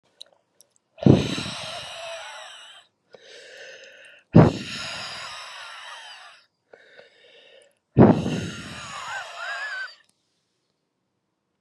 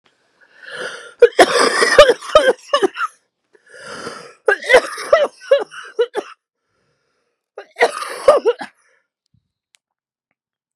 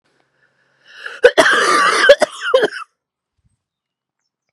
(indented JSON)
{
  "exhalation_length": "11.6 s",
  "exhalation_amplitude": 32767,
  "exhalation_signal_mean_std_ratio": 0.3,
  "three_cough_length": "10.8 s",
  "three_cough_amplitude": 32768,
  "three_cough_signal_mean_std_ratio": 0.37,
  "cough_length": "4.5 s",
  "cough_amplitude": 32768,
  "cough_signal_mean_std_ratio": 0.41,
  "survey_phase": "beta (2021-08-13 to 2022-03-07)",
  "age": "18-44",
  "gender": "Female",
  "wearing_mask": "No",
  "symptom_cough_any": true,
  "symptom_new_continuous_cough": true,
  "symptom_runny_or_blocked_nose": true,
  "symptom_shortness_of_breath": true,
  "symptom_fatigue": true,
  "symptom_fever_high_temperature": true,
  "symptom_headache": true,
  "smoker_status": "Ex-smoker",
  "respiratory_condition_asthma": false,
  "respiratory_condition_other": false,
  "recruitment_source": "Test and Trace",
  "submission_delay": "1 day",
  "covid_test_result": "Positive",
  "covid_test_method": "ePCR"
}